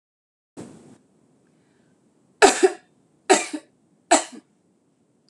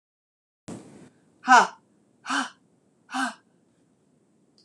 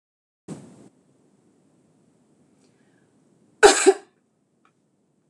{"three_cough_length": "5.3 s", "three_cough_amplitude": 26027, "three_cough_signal_mean_std_ratio": 0.24, "exhalation_length": "4.6 s", "exhalation_amplitude": 21202, "exhalation_signal_mean_std_ratio": 0.24, "cough_length": "5.3 s", "cough_amplitude": 26027, "cough_signal_mean_std_ratio": 0.18, "survey_phase": "beta (2021-08-13 to 2022-03-07)", "age": "45-64", "gender": "Female", "wearing_mask": "No", "symptom_none": true, "smoker_status": "Ex-smoker", "respiratory_condition_asthma": false, "respiratory_condition_other": false, "recruitment_source": "REACT", "submission_delay": "2 days", "covid_test_result": "Negative", "covid_test_method": "RT-qPCR"}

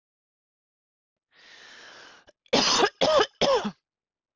{"three_cough_length": "4.4 s", "three_cough_amplitude": 12245, "three_cough_signal_mean_std_ratio": 0.39, "survey_phase": "beta (2021-08-13 to 2022-03-07)", "age": "18-44", "gender": "Female", "wearing_mask": "No", "symptom_none": true, "symptom_onset": "9 days", "smoker_status": "Ex-smoker", "respiratory_condition_asthma": false, "respiratory_condition_other": false, "recruitment_source": "REACT", "submission_delay": "1 day", "covid_test_result": "Negative", "covid_test_method": "RT-qPCR"}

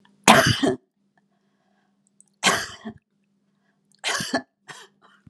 {"three_cough_length": "5.3 s", "three_cough_amplitude": 32767, "three_cough_signal_mean_std_ratio": 0.31, "survey_phase": "alpha (2021-03-01 to 2021-08-12)", "age": "65+", "gender": "Female", "wearing_mask": "No", "symptom_none": true, "smoker_status": "Never smoked", "respiratory_condition_asthma": false, "respiratory_condition_other": false, "recruitment_source": "REACT", "submission_delay": "2 days", "covid_test_result": "Negative", "covid_test_method": "RT-qPCR"}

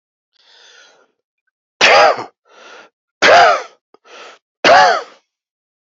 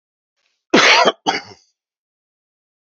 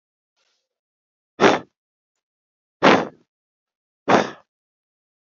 {"three_cough_length": "6.0 s", "three_cough_amplitude": 29913, "three_cough_signal_mean_std_ratio": 0.38, "cough_length": "2.8 s", "cough_amplitude": 31457, "cough_signal_mean_std_ratio": 0.34, "exhalation_length": "5.3 s", "exhalation_amplitude": 30236, "exhalation_signal_mean_std_ratio": 0.25, "survey_phase": "alpha (2021-03-01 to 2021-08-12)", "age": "45-64", "gender": "Male", "wearing_mask": "No", "symptom_none": true, "smoker_status": "Ex-smoker", "respiratory_condition_asthma": false, "respiratory_condition_other": false, "recruitment_source": "REACT", "submission_delay": "1 day", "covid_test_result": "Negative", "covid_test_method": "RT-qPCR"}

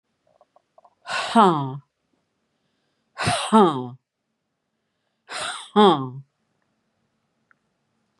{"exhalation_length": "8.2 s", "exhalation_amplitude": 24737, "exhalation_signal_mean_std_ratio": 0.32, "survey_phase": "beta (2021-08-13 to 2022-03-07)", "age": "45-64", "gender": "Female", "wearing_mask": "No", "symptom_cough_any": true, "symptom_runny_or_blocked_nose": true, "symptom_sore_throat": true, "symptom_fatigue": true, "symptom_headache": true, "symptom_onset": "7 days", "smoker_status": "Never smoked", "respiratory_condition_asthma": false, "respiratory_condition_other": false, "recruitment_source": "Test and Trace", "submission_delay": "1 day", "covid_test_result": "Negative", "covid_test_method": "RT-qPCR"}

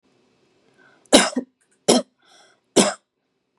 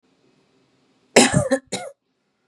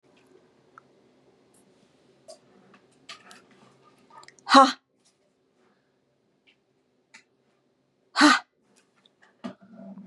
{"three_cough_length": "3.6 s", "three_cough_amplitude": 32767, "three_cough_signal_mean_std_ratio": 0.28, "cough_length": "2.5 s", "cough_amplitude": 32768, "cough_signal_mean_std_ratio": 0.31, "exhalation_length": "10.1 s", "exhalation_amplitude": 29507, "exhalation_signal_mean_std_ratio": 0.18, "survey_phase": "beta (2021-08-13 to 2022-03-07)", "age": "45-64", "gender": "Female", "wearing_mask": "No", "symptom_runny_or_blocked_nose": true, "symptom_fatigue": true, "smoker_status": "Never smoked", "respiratory_condition_asthma": false, "respiratory_condition_other": false, "recruitment_source": "Test and Trace", "submission_delay": "0 days", "covid_test_result": "Negative", "covid_test_method": "LFT"}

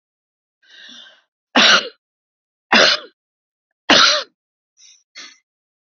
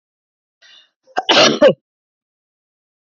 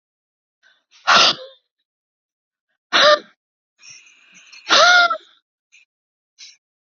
{"three_cough_length": "5.9 s", "three_cough_amplitude": 30274, "three_cough_signal_mean_std_ratio": 0.32, "cough_length": "3.2 s", "cough_amplitude": 28773, "cough_signal_mean_std_ratio": 0.3, "exhalation_length": "7.0 s", "exhalation_amplitude": 30267, "exhalation_signal_mean_std_ratio": 0.31, "survey_phase": "beta (2021-08-13 to 2022-03-07)", "age": "65+", "gender": "Female", "wearing_mask": "No", "symptom_none": true, "smoker_status": "Never smoked", "respiratory_condition_asthma": true, "respiratory_condition_other": false, "recruitment_source": "REACT", "submission_delay": "1 day", "covid_test_result": "Negative", "covid_test_method": "RT-qPCR"}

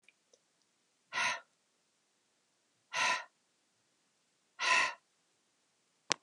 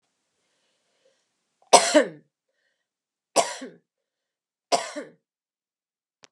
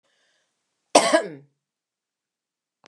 {"exhalation_length": "6.2 s", "exhalation_amplitude": 20839, "exhalation_signal_mean_std_ratio": 0.29, "three_cough_length": "6.3 s", "three_cough_amplitude": 32767, "three_cough_signal_mean_std_ratio": 0.21, "cough_length": "2.9 s", "cough_amplitude": 29926, "cough_signal_mean_std_ratio": 0.23, "survey_phase": "beta (2021-08-13 to 2022-03-07)", "age": "65+", "gender": "Female", "wearing_mask": "No", "symptom_none": true, "smoker_status": "Never smoked", "respiratory_condition_asthma": false, "respiratory_condition_other": false, "recruitment_source": "REACT", "submission_delay": "2 days", "covid_test_result": "Negative", "covid_test_method": "RT-qPCR", "influenza_a_test_result": "Negative", "influenza_b_test_result": "Negative"}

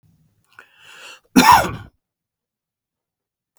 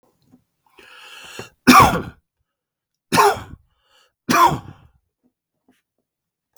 {"cough_length": "3.6 s", "cough_amplitude": 32768, "cough_signal_mean_std_ratio": 0.25, "three_cough_length": "6.6 s", "three_cough_amplitude": 32768, "three_cough_signal_mean_std_ratio": 0.29, "survey_phase": "beta (2021-08-13 to 2022-03-07)", "age": "65+", "gender": "Male", "wearing_mask": "No", "symptom_runny_or_blocked_nose": true, "smoker_status": "Ex-smoker", "respiratory_condition_asthma": true, "respiratory_condition_other": false, "recruitment_source": "Test and Trace", "submission_delay": "2 days", "covid_test_result": "Positive", "covid_test_method": "RT-qPCR", "covid_ct_value": 16.9, "covid_ct_gene": "ORF1ab gene", "covid_ct_mean": 17.2, "covid_viral_load": "2200000 copies/ml", "covid_viral_load_category": "High viral load (>1M copies/ml)"}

